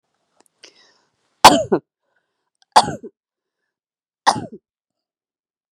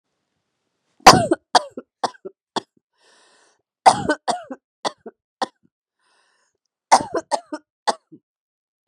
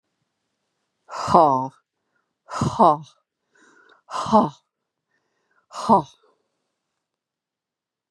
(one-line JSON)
{"three_cough_length": "5.7 s", "three_cough_amplitude": 32768, "three_cough_signal_mean_std_ratio": 0.2, "cough_length": "8.9 s", "cough_amplitude": 32768, "cough_signal_mean_std_ratio": 0.23, "exhalation_length": "8.1 s", "exhalation_amplitude": 30793, "exhalation_signal_mean_std_ratio": 0.29, "survey_phase": "beta (2021-08-13 to 2022-03-07)", "age": "65+", "gender": "Female", "wearing_mask": "No", "symptom_cough_any": true, "symptom_runny_or_blocked_nose": true, "symptom_fatigue": true, "symptom_onset": "2 days", "smoker_status": "Ex-smoker", "respiratory_condition_asthma": false, "respiratory_condition_other": false, "recruitment_source": "Test and Trace", "submission_delay": "1 day", "covid_test_result": "Positive", "covid_test_method": "RT-qPCR", "covid_ct_value": 18.5, "covid_ct_gene": "N gene", "covid_ct_mean": 19.0, "covid_viral_load": "590000 copies/ml", "covid_viral_load_category": "Low viral load (10K-1M copies/ml)"}